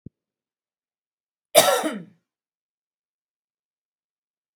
{"cough_length": "4.6 s", "cough_amplitude": 31152, "cough_signal_mean_std_ratio": 0.2, "survey_phase": "beta (2021-08-13 to 2022-03-07)", "age": "45-64", "gender": "Female", "wearing_mask": "No", "symptom_none": true, "smoker_status": "Never smoked", "respiratory_condition_asthma": false, "respiratory_condition_other": false, "recruitment_source": "REACT", "submission_delay": "2 days", "covid_test_result": "Negative", "covid_test_method": "RT-qPCR"}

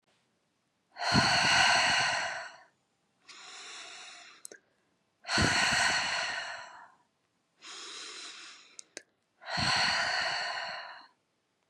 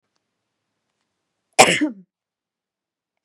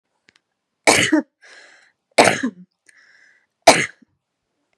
{"exhalation_length": "11.7 s", "exhalation_amplitude": 9000, "exhalation_signal_mean_std_ratio": 0.53, "cough_length": "3.2 s", "cough_amplitude": 32768, "cough_signal_mean_std_ratio": 0.2, "three_cough_length": "4.8 s", "three_cough_amplitude": 32768, "three_cough_signal_mean_std_ratio": 0.29, "survey_phase": "beta (2021-08-13 to 2022-03-07)", "age": "18-44", "gender": "Female", "wearing_mask": "No", "symptom_none": true, "smoker_status": "Never smoked", "respiratory_condition_asthma": false, "respiratory_condition_other": false, "recruitment_source": "REACT", "submission_delay": "0 days", "covid_test_result": "Negative", "covid_test_method": "RT-qPCR", "influenza_a_test_result": "Negative", "influenza_b_test_result": "Negative"}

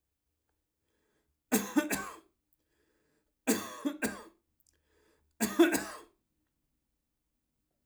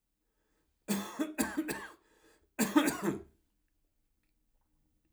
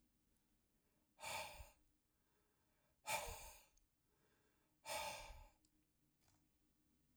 {"three_cough_length": "7.9 s", "three_cough_amplitude": 8222, "three_cough_signal_mean_std_ratio": 0.29, "cough_length": "5.1 s", "cough_amplitude": 8289, "cough_signal_mean_std_ratio": 0.37, "exhalation_length": "7.2 s", "exhalation_amplitude": 860, "exhalation_signal_mean_std_ratio": 0.37, "survey_phase": "alpha (2021-03-01 to 2021-08-12)", "age": "65+", "gender": "Male", "wearing_mask": "No", "symptom_none": true, "smoker_status": "Never smoked", "respiratory_condition_asthma": false, "respiratory_condition_other": false, "recruitment_source": "REACT", "submission_delay": "1 day", "covid_test_result": "Negative", "covid_test_method": "RT-qPCR"}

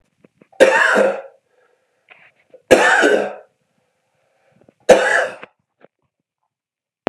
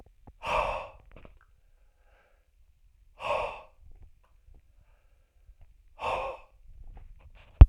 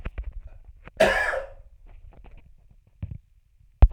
{"three_cough_length": "7.1 s", "three_cough_amplitude": 32768, "three_cough_signal_mean_std_ratio": 0.37, "exhalation_length": "7.7 s", "exhalation_amplitude": 32768, "exhalation_signal_mean_std_ratio": 0.17, "cough_length": "3.9 s", "cough_amplitude": 28100, "cough_signal_mean_std_ratio": 0.3, "survey_phase": "alpha (2021-03-01 to 2021-08-12)", "age": "45-64", "gender": "Male", "wearing_mask": "No", "symptom_none": true, "smoker_status": "Ex-smoker", "respiratory_condition_asthma": false, "respiratory_condition_other": false, "recruitment_source": "REACT", "submission_delay": "2 days", "covid_test_result": "Negative", "covid_test_method": "RT-qPCR"}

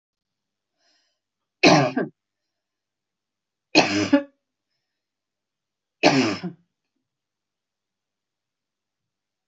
{"three_cough_length": "9.5 s", "three_cough_amplitude": 24902, "three_cough_signal_mean_std_ratio": 0.26, "survey_phase": "beta (2021-08-13 to 2022-03-07)", "age": "65+", "gender": "Female", "wearing_mask": "No", "symptom_none": true, "smoker_status": "Ex-smoker", "respiratory_condition_asthma": false, "respiratory_condition_other": false, "recruitment_source": "REACT", "submission_delay": "1 day", "covid_test_result": "Negative", "covid_test_method": "RT-qPCR"}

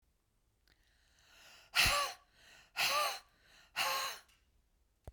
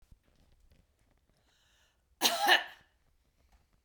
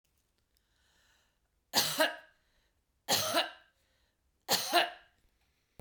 {"exhalation_length": "5.1 s", "exhalation_amplitude": 5542, "exhalation_signal_mean_std_ratio": 0.4, "cough_length": "3.8 s", "cough_amplitude": 11468, "cough_signal_mean_std_ratio": 0.25, "three_cough_length": "5.8 s", "three_cough_amplitude": 8642, "three_cough_signal_mean_std_ratio": 0.34, "survey_phase": "beta (2021-08-13 to 2022-03-07)", "age": "45-64", "gender": "Female", "wearing_mask": "No", "symptom_none": true, "smoker_status": "Ex-smoker", "respiratory_condition_asthma": false, "respiratory_condition_other": false, "recruitment_source": "REACT", "submission_delay": "7 days", "covid_test_result": "Negative", "covid_test_method": "RT-qPCR", "influenza_a_test_result": "Negative", "influenza_b_test_result": "Negative"}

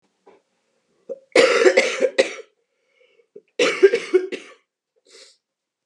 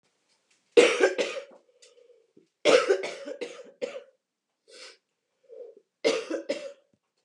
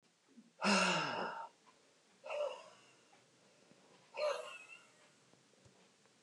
{"cough_length": "5.9 s", "cough_amplitude": 32571, "cough_signal_mean_std_ratio": 0.36, "three_cough_length": "7.2 s", "three_cough_amplitude": 20908, "three_cough_signal_mean_std_ratio": 0.34, "exhalation_length": "6.2 s", "exhalation_amplitude": 3049, "exhalation_signal_mean_std_ratio": 0.41, "survey_phase": "beta (2021-08-13 to 2022-03-07)", "age": "18-44", "gender": "Female", "wearing_mask": "No", "symptom_cough_any": true, "symptom_new_continuous_cough": true, "symptom_runny_or_blocked_nose": true, "symptom_sore_throat": true, "symptom_fatigue": true, "symptom_headache": true, "symptom_onset": "3 days", "smoker_status": "Current smoker (11 or more cigarettes per day)", "respiratory_condition_asthma": false, "respiratory_condition_other": false, "recruitment_source": "Test and Trace", "submission_delay": "1 day", "covid_test_result": "Negative", "covid_test_method": "RT-qPCR"}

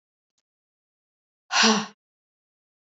{"exhalation_length": "2.8 s", "exhalation_amplitude": 17508, "exhalation_signal_mean_std_ratio": 0.26, "survey_phase": "alpha (2021-03-01 to 2021-08-12)", "age": "18-44", "gender": "Female", "wearing_mask": "No", "symptom_none": true, "smoker_status": "Never smoked", "respiratory_condition_asthma": false, "respiratory_condition_other": false, "recruitment_source": "REACT", "submission_delay": "2 days", "covid_test_result": "Negative", "covid_test_method": "RT-qPCR"}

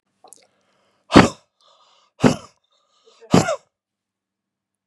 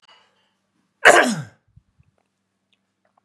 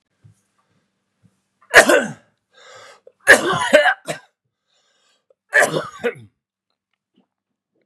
{"exhalation_length": "4.9 s", "exhalation_amplitude": 32768, "exhalation_signal_mean_std_ratio": 0.22, "cough_length": "3.2 s", "cough_amplitude": 32768, "cough_signal_mean_std_ratio": 0.23, "three_cough_length": "7.9 s", "three_cough_amplitude": 32768, "three_cough_signal_mean_std_ratio": 0.29, "survey_phase": "beta (2021-08-13 to 2022-03-07)", "age": "65+", "gender": "Male", "wearing_mask": "No", "symptom_cough_any": true, "smoker_status": "Never smoked", "respiratory_condition_asthma": false, "respiratory_condition_other": false, "recruitment_source": "REACT", "submission_delay": "2 days", "covid_test_result": "Negative", "covid_test_method": "RT-qPCR", "influenza_a_test_result": "Negative", "influenza_b_test_result": "Negative"}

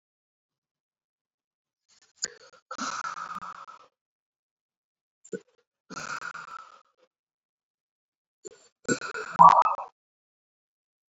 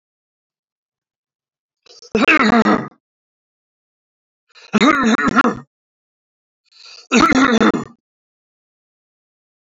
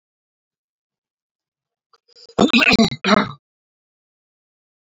{"exhalation_length": "11.1 s", "exhalation_amplitude": 24502, "exhalation_signal_mean_std_ratio": 0.2, "three_cough_length": "9.7 s", "three_cough_amplitude": 27674, "three_cough_signal_mean_std_ratio": 0.37, "cough_length": "4.9 s", "cough_amplitude": 27734, "cough_signal_mean_std_ratio": 0.29, "survey_phase": "beta (2021-08-13 to 2022-03-07)", "age": "45-64", "gender": "Male", "wearing_mask": "No", "symptom_none": true, "smoker_status": "Ex-smoker", "respiratory_condition_asthma": false, "respiratory_condition_other": false, "recruitment_source": "REACT", "submission_delay": "2 days", "covid_test_result": "Negative", "covid_test_method": "RT-qPCR"}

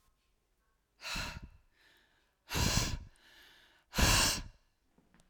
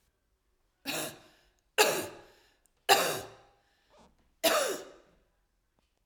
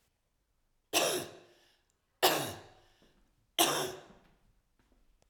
{"exhalation_length": "5.3 s", "exhalation_amplitude": 5536, "exhalation_signal_mean_std_ratio": 0.38, "cough_length": "6.1 s", "cough_amplitude": 15904, "cough_signal_mean_std_ratio": 0.33, "three_cough_length": "5.3 s", "three_cough_amplitude": 10571, "three_cough_signal_mean_std_ratio": 0.33, "survey_phase": "alpha (2021-03-01 to 2021-08-12)", "age": "45-64", "gender": "Female", "wearing_mask": "No", "symptom_none": true, "smoker_status": "Ex-smoker", "respiratory_condition_asthma": false, "respiratory_condition_other": false, "recruitment_source": "REACT", "submission_delay": "1 day", "covid_test_result": "Negative", "covid_test_method": "RT-qPCR"}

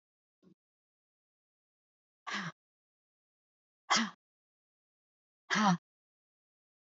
{"exhalation_length": "6.8 s", "exhalation_amplitude": 7294, "exhalation_signal_mean_std_ratio": 0.23, "survey_phase": "beta (2021-08-13 to 2022-03-07)", "age": "45-64", "gender": "Female", "wearing_mask": "No", "symptom_none": true, "smoker_status": "Never smoked", "respiratory_condition_asthma": false, "respiratory_condition_other": false, "recruitment_source": "REACT", "submission_delay": "1 day", "covid_test_result": "Negative", "covid_test_method": "RT-qPCR", "influenza_a_test_result": "Negative", "influenza_b_test_result": "Negative"}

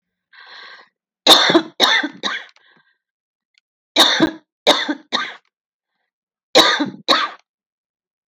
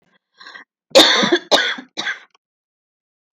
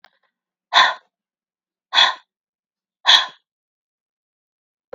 {"three_cough_length": "8.3 s", "three_cough_amplitude": 32768, "three_cough_signal_mean_std_ratio": 0.38, "cough_length": "3.3 s", "cough_amplitude": 32768, "cough_signal_mean_std_ratio": 0.37, "exhalation_length": "4.9 s", "exhalation_amplitude": 32768, "exhalation_signal_mean_std_ratio": 0.25, "survey_phase": "beta (2021-08-13 to 2022-03-07)", "age": "18-44", "gender": "Female", "wearing_mask": "No", "symptom_cough_any": true, "symptom_sore_throat": true, "symptom_fatigue": true, "symptom_headache": true, "symptom_other": true, "symptom_onset": "12 days", "smoker_status": "Ex-smoker", "respiratory_condition_asthma": false, "respiratory_condition_other": false, "recruitment_source": "REACT", "submission_delay": "1 day", "covid_test_result": "Negative", "covid_test_method": "RT-qPCR"}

